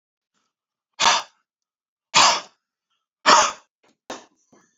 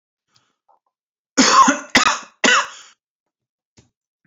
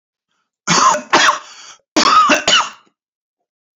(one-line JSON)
{"exhalation_length": "4.8 s", "exhalation_amplitude": 27083, "exhalation_signal_mean_std_ratio": 0.3, "three_cough_length": "4.3 s", "three_cough_amplitude": 32066, "three_cough_signal_mean_std_ratio": 0.36, "cough_length": "3.8 s", "cough_amplitude": 30603, "cough_signal_mean_std_ratio": 0.5, "survey_phase": "alpha (2021-03-01 to 2021-08-12)", "age": "65+", "gender": "Male", "wearing_mask": "No", "symptom_none": true, "smoker_status": "Never smoked", "respiratory_condition_asthma": false, "respiratory_condition_other": false, "recruitment_source": "REACT", "submission_delay": "3 days", "covid_test_result": "Negative", "covid_test_method": "RT-qPCR"}